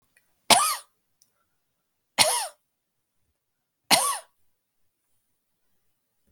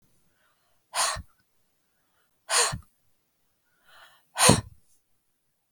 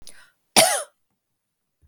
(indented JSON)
{
  "three_cough_length": "6.3 s",
  "three_cough_amplitude": 32766,
  "three_cough_signal_mean_std_ratio": 0.25,
  "exhalation_length": "5.7 s",
  "exhalation_amplitude": 32768,
  "exhalation_signal_mean_std_ratio": 0.26,
  "cough_length": "1.9 s",
  "cough_amplitude": 32766,
  "cough_signal_mean_std_ratio": 0.28,
  "survey_phase": "beta (2021-08-13 to 2022-03-07)",
  "age": "45-64",
  "gender": "Female",
  "wearing_mask": "No",
  "symptom_none": true,
  "symptom_onset": "9 days",
  "smoker_status": "Never smoked",
  "respiratory_condition_asthma": false,
  "respiratory_condition_other": false,
  "recruitment_source": "REACT",
  "submission_delay": "0 days",
  "covid_test_result": "Negative",
  "covid_test_method": "RT-qPCR",
  "influenza_a_test_result": "Negative",
  "influenza_b_test_result": "Negative"
}